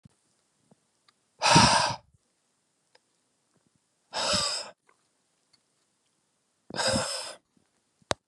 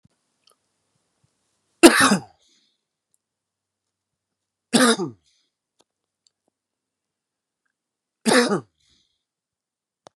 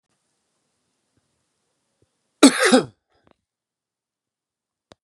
exhalation_length: 8.3 s
exhalation_amplitude: 20687
exhalation_signal_mean_std_ratio: 0.31
three_cough_length: 10.2 s
three_cough_amplitude: 32768
three_cough_signal_mean_std_ratio: 0.22
cough_length: 5.0 s
cough_amplitude: 32767
cough_signal_mean_std_ratio: 0.19
survey_phase: beta (2021-08-13 to 2022-03-07)
age: 45-64
gender: Male
wearing_mask: 'No'
symptom_cough_any: true
symptom_runny_or_blocked_nose: true
symptom_fatigue: true
symptom_headache: true
symptom_onset: 2 days
smoker_status: Ex-smoker
respiratory_condition_asthma: false
respiratory_condition_other: false
recruitment_source: Test and Trace
submission_delay: 2 days
covid_test_result: Positive
covid_test_method: RT-qPCR
covid_ct_value: 18.4
covid_ct_gene: ORF1ab gene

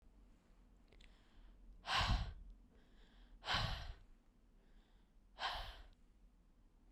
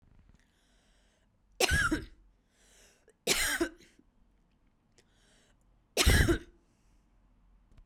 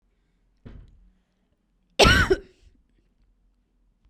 exhalation_length: 6.9 s
exhalation_amplitude: 2089
exhalation_signal_mean_std_ratio: 0.42
three_cough_length: 7.9 s
three_cough_amplitude: 12794
three_cough_signal_mean_std_ratio: 0.32
cough_length: 4.1 s
cough_amplitude: 25227
cough_signal_mean_std_ratio: 0.24
survey_phase: beta (2021-08-13 to 2022-03-07)
age: 18-44
gender: Female
wearing_mask: 'No'
symptom_none: true
smoker_status: Never smoked
respiratory_condition_asthma: false
respiratory_condition_other: false
recruitment_source: REACT
submission_delay: 1 day
covid_test_result: Negative
covid_test_method: RT-qPCR
influenza_a_test_result: Negative
influenza_b_test_result: Negative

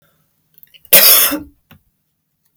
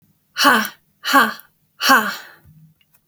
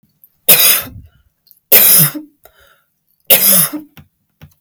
cough_length: 2.6 s
cough_amplitude: 32768
cough_signal_mean_std_ratio: 0.34
exhalation_length: 3.1 s
exhalation_amplitude: 31817
exhalation_signal_mean_std_ratio: 0.43
three_cough_length: 4.6 s
three_cough_amplitude: 32768
three_cough_signal_mean_std_ratio: 0.43
survey_phase: beta (2021-08-13 to 2022-03-07)
age: 18-44
gender: Female
wearing_mask: 'No'
symptom_none: true
smoker_status: Never smoked
respiratory_condition_asthma: true
respiratory_condition_other: false
recruitment_source: REACT
submission_delay: 2 days
covid_test_result: Negative
covid_test_method: RT-qPCR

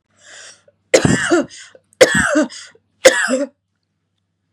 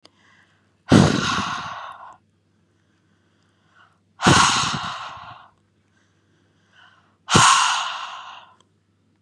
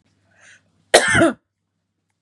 three_cough_length: 4.5 s
three_cough_amplitude: 32768
three_cough_signal_mean_std_ratio: 0.41
exhalation_length: 9.2 s
exhalation_amplitude: 32767
exhalation_signal_mean_std_ratio: 0.37
cough_length: 2.2 s
cough_amplitude: 32768
cough_signal_mean_std_ratio: 0.32
survey_phase: beta (2021-08-13 to 2022-03-07)
age: 18-44
gender: Female
wearing_mask: 'No'
symptom_headache: true
symptom_onset: 3 days
smoker_status: Never smoked
respiratory_condition_asthma: false
respiratory_condition_other: false
recruitment_source: REACT
submission_delay: 4 days
covid_test_result: Negative
covid_test_method: RT-qPCR
influenza_a_test_result: Negative
influenza_b_test_result: Negative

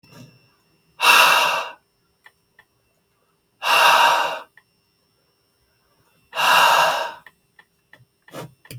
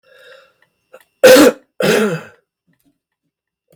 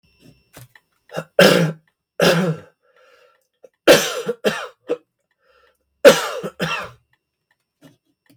exhalation_length: 8.8 s
exhalation_amplitude: 31356
exhalation_signal_mean_std_ratio: 0.41
cough_length: 3.8 s
cough_amplitude: 32768
cough_signal_mean_std_ratio: 0.34
three_cough_length: 8.4 s
three_cough_amplitude: 32768
three_cough_signal_mean_std_ratio: 0.33
survey_phase: beta (2021-08-13 to 2022-03-07)
age: 45-64
gender: Male
wearing_mask: 'No'
symptom_none: true
smoker_status: Never smoked
respiratory_condition_asthma: false
respiratory_condition_other: false
recruitment_source: REACT
submission_delay: 1 day
covid_test_result: Negative
covid_test_method: RT-qPCR
influenza_a_test_result: Negative
influenza_b_test_result: Negative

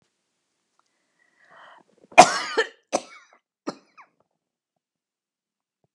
cough_length: 5.9 s
cough_amplitude: 32768
cough_signal_mean_std_ratio: 0.16
survey_phase: beta (2021-08-13 to 2022-03-07)
age: 65+
gender: Female
wearing_mask: 'No'
symptom_runny_or_blocked_nose: true
smoker_status: Never smoked
respiratory_condition_asthma: true
respiratory_condition_other: false
recruitment_source: REACT
submission_delay: 2 days
covid_test_result: Negative
covid_test_method: RT-qPCR
influenza_a_test_result: Negative
influenza_b_test_result: Negative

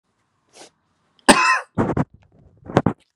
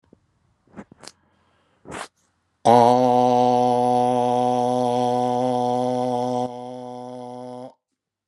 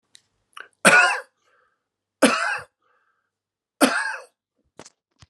cough_length: 3.2 s
cough_amplitude: 32768
cough_signal_mean_std_ratio: 0.34
exhalation_length: 8.3 s
exhalation_amplitude: 27571
exhalation_signal_mean_std_ratio: 0.57
three_cough_length: 5.3 s
three_cough_amplitude: 32565
three_cough_signal_mean_std_ratio: 0.32
survey_phase: beta (2021-08-13 to 2022-03-07)
age: 45-64
gender: Male
wearing_mask: 'No'
symptom_none: true
symptom_onset: 3 days
smoker_status: Ex-smoker
respiratory_condition_asthma: false
respiratory_condition_other: false
recruitment_source: Test and Trace
submission_delay: 2 days
covid_test_result: Positive
covid_test_method: RT-qPCR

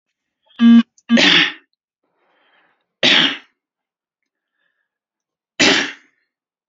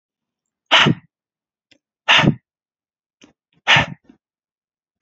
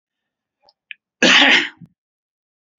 three_cough_length: 6.7 s
three_cough_amplitude: 30662
three_cough_signal_mean_std_ratio: 0.35
exhalation_length: 5.0 s
exhalation_amplitude: 29344
exhalation_signal_mean_std_ratio: 0.29
cough_length: 2.8 s
cough_amplitude: 29746
cough_signal_mean_std_ratio: 0.32
survey_phase: beta (2021-08-13 to 2022-03-07)
age: 18-44
gender: Male
wearing_mask: 'No'
symptom_cough_any: true
symptom_sore_throat: true
symptom_other: true
symptom_onset: 4 days
smoker_status: Never smoked
respiratory_condition_asthma: false
respiratory_condition_other: false
recruitment_source: Test and Trace
submission_delay: 2 days
covid_test_result: Positive
covid_test_method: RT-qPCR
covid_ct_value: 20.9
covid_ct_gene: ORF1ab gene
covid_ct_mean: 21.6
covid_viral_load: 81000 copies/ml
covid_viral_load_category: Low viral load (10K-1M copies/ml)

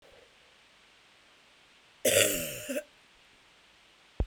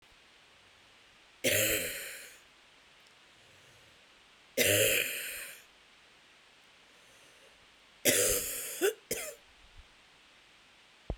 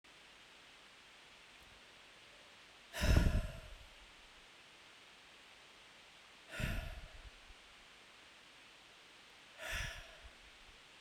cough_length: 4.3 s
cough_amplitude: 13645
cough_signal_mean_std_ratio: 0.33
three_cough_length: 11.2 s
three_cough_amplitude: 11197
three_cough_signal_mean_std_ratio: 0.4
exhalation_length: 11.0 s
exhalation_amplitude: 5098
exhalation_signal_mean_std_ratio: 0.35
survey_phase: beta (2021-08-13 to 2022-03-07)
age: 45-64
gender: Female
wearing_mask: 'No'
symptom_cough_any: true
symptom_sore_throat: true
symptom_fatigue: true
symptom_fever_high_temperature: true
symptom_headache: true
symptom_other: true
symptom_onset: 3 days
smoker_status: Never smoked
respiratory_condition_asthma: false
respiratory_condition_other: false
recruitment_source: Test and Trace
submission_delay: 1 day
covid_test_result: Positive
covid_test_method: RT-qPCR
covid_ct_value: 20.7
covid_ct_gene: ORF1ab gene
covid_ct_mean: 20.9
covid_viral_load: 140000 copies/ml
covid_viral_load_category: Low viral load (10K-1M copies/ml)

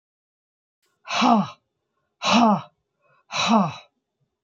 exhalation_length: 4.4 s
exhalation_amplitude: 16820
exhalation_signal_mean_std_ratio: 0.42
survey_phase: beta (2021-08-13 to 2022-03-07)
age: 65+
gender: Female
wearing_mask: 'No'
symptom_none: true
smoker_status: Never smoked
respiratory_condition_asthma: false
respiratory_condition_other: false
recruitment_source: REACT
submission_delay: 3 days
covid_test_result: Negative
covid_test_method: RT-qPCR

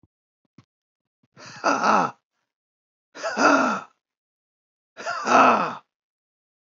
exhalation_length: 6.7 s
exhalation_amplitude: 25422
exhalation_signal_mean_std_ratio: 0.38
survey_phase: beta (2021-08-13 to 2022-03-07)
age: 65+
gender: Male
wearing_mask: 'No'
symptom_diarrhoea: true
symptom_fatigue: true
symptom_onset: 12 days
smoker_status: Never smoked
respiratory_condition_asthma: false
respiratory_condition_other: false
recruitment_source: REACT
submission_delay: 3 days
covid_test_result: Negative
covid_test_method: RT-qPCR
influenza_a_test_result: Negative
influenza_b_test_result: Negative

